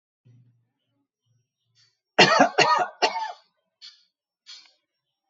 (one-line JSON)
{"three_cough_length": "5.3 s", "three_cough_amplitude": 26179, "three_cough_signal_mean_std_ratio": 0.3, "survey_phase": "alpha (2021-03-01 to 2021-08-12)", "age": "65+", "gender": "Male", "wearing_mask": "No", "symptom_none": true, "smoker_status": "Ex-smoker", "respiratory_condition_asthma": false, "respiratory_condition_other": false, "recruitment_source": "REACT", "submission_delay": "2 days", "covid_test_result": "Negative", "covid_test_method": "RT-qPCR"}